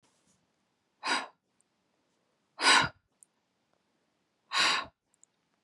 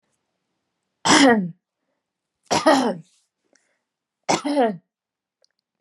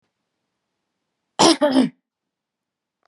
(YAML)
exhalation_length: 5.6 s
exhalation_amplitude: 10627
exhalation_signal_mean_std_ratio: 0.28
three_cough_length: 5.8 s
three_cough_amplitude: 31302
three_cough_signal_mean_std_ratio: 0.36
cough_length: 3.1 s
cough_amplitude: 29433
cough_signal_mean_std_ratio: 0.3
survey_phase: beta (2021-08-13 to 2022-03-07)
age: 45-64
gender: Female
wearing_mask: 'No'
symptom_none: true
smoker_status: Never smoked
respiratory_condition_asthma: false
respiratory_condition_other: false
recruitment_source: REACT
submission_delay: 1 day
covid_test_result: Negative
covid_test_method: RT-qPCR